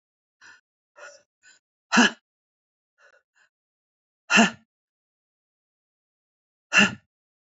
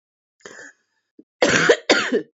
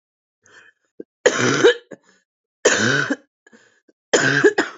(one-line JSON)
{"exhalation_length": "7.6 s", "exhalation_amplitude": 23323, "exhalation_signal_mean_std_ratio": 0.21, "cough_length": "2.4 s", "cough_amplitude": 27757, "cough_signal_mean_std_ratio": 0.42, "three_cough_length": "4.8 s", "three_cough_amplitude": 31846, "three_cough_signal_mean_std_ratio": 0.43, "survey_phase": "beta (2021-08-13 to 2022-03-07)", "age": "45-64", "gender": "Female", "wearing_mask": "No", "symptom_none": true, "smoker_status": "Current smoker (1 to 10 cigarettes per day)", "respiratory_condition_asthma": false, "respiratory_condition_other": false, "recruitment_source": "REACT", "submission_delay": "1 day", "covid_test_result": "Negative", "covid_test_method": "RT-qPCR", "influenza_a_test_result": "Negative", "influenza_b_test_result": "Negative"}